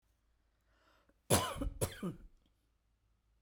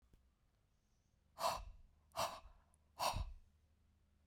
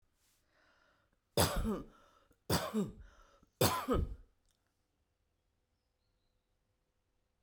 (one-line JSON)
{"cough_length": "3.4 s", "cough_amplitude": 6328, "cough_signal_mean_std_ratio": 0.32, "exhalation_length": "4.3 s", "exhalation_amplitude": 1692, "exhalation_signal_mean_std_ratio": 0.38, "three_cough_length": "7.4 s", "three_cough_amplitude": 5360, "three_cough_signal_mean_std_ratio": 0.33, "survey_phase": "beta (2021-08-13 to 2022-03-07)", "age": "65+", "gender": "Female", "wearing_mask": "No", "symptom_none": true, "smoker_status": "Ex-smoker", "respiratory_condition_asthma": false, "respiratory_condition_other": false, "recruitment_source": "Test and Trace", "submission_delay": "0 days", "covid_test_result": "Negative", "covid_test_method": "LFT"}